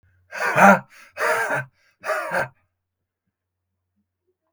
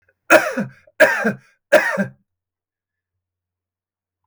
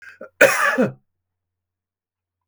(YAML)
exhalation_length: 4.5 s
exhalation_amplitude: 32768
exhalation_signal_mean_std_ratio: 0.35
three_cough_length: 4.3 s
three_cough_amplitude: 32768
three_cough_signal_mean_std_ratio: 0.33
cough_length: 2.5 s
cough_amplitude: 32768
cough_signal_mean_std_ratio: 0.33
survey_phase: beta (2021-08-13 to 2022-03-07)
age: 45-64
gender: Male
wearing_mask: 'No'
symptom_none: true
smoker_status: Never smoked
respiratory_condition_asthma: false
respiratory_condition_other: false
recruitment_source: REACT
submission_delay: 2 days
covid_test_result: Negative
covid_test_method: RT-qPCR